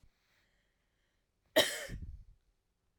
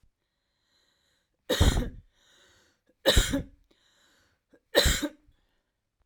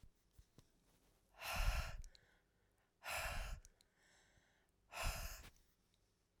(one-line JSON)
{"cough_length": "3.0 s", "cough_amplitude": 7893, "cough_signal_mean_std_ratio": 0.25, "three_cough_length": "6.1 s", "three_cough_amplitude": 17573, "three_cough_signal_mean_std_ratio": 0.31, "exhalation_length": "6.4 s", "exhalation_amplitude": 1453, "exhalation_signal_mean_std_ratio": 0.43, "survey_phase": "alpha (2021-03-01 to 2021-08-12)", "age": "45-64", "gender": "Female", "wearing_mask": "No", "symptom_fatigue": true, "smoker_status": "Ex-smoker", "respiratory_condition_asthma": true, "respiratory_condition_other": false, "recruitment_source": "REACT", "submission_delay": "2 days", "covid_test_result": "Negative", "covid_test_method": "RT-qPCR"}